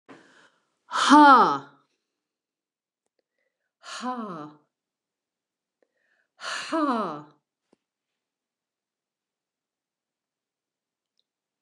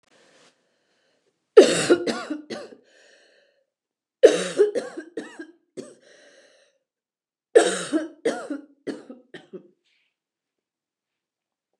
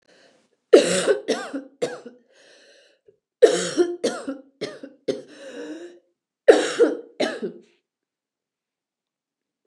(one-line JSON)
{"exhalation_length": "11.6 s", "exhalation_amplitude": 24847, "exhalation_signal_mean_std_ratio": 0.24, "three_cough_length": "11.8 s", "three_cough_amplitude": 29204, "three_cough_signal_mean_std_ratio": 0.26, "cough_length": "9.7 s", "cough_amplitude": 29204, "cough_signal_mean_std_ratio": 0.33, "survey_phase": "beta (2021-08-13 to 2022-03-07)", "age": "65+", "gender": "Female", "wearing_mask": "No", "symptom_cough_any": true, "symptom_fatigue": true, "smoker_status": "Never smoked", "respiratory_condition_asthma": false, "respiratory_condition_other": false, "recruitment_source": "REACT", "submission_delay": "1 day", "covid_test_result": "Negative", "covid_test_method": "RT-qPCR", "influenza_a_test_result": "Negative", "influenza_b_test_result": "Negative"}